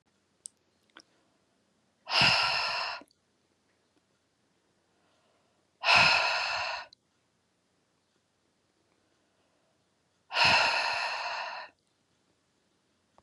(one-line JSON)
{"exhalation_length": "13.2 s", "exhalation_amplitude": 12245, "exhalation_signal_mean_std_ratio": 0.36, "survey_phase": "beta (2021-08-13 to 2022-03-07)", "age": "45-64", "gender": "Female", "wearing_mask": "No", "symptom_none": true, "smoker_status": "Never smoked", "respiratory_condition_asthma": false, "respiratory_condition_other": false, "recruitment_source": "REACT", "submission_delay": "2 days", "covid_test_result": "Negative", "covid_test_method": "RT-qPCR", "influenza_a_test_result": "Negative", "influenza_b_test_result": "Negative"}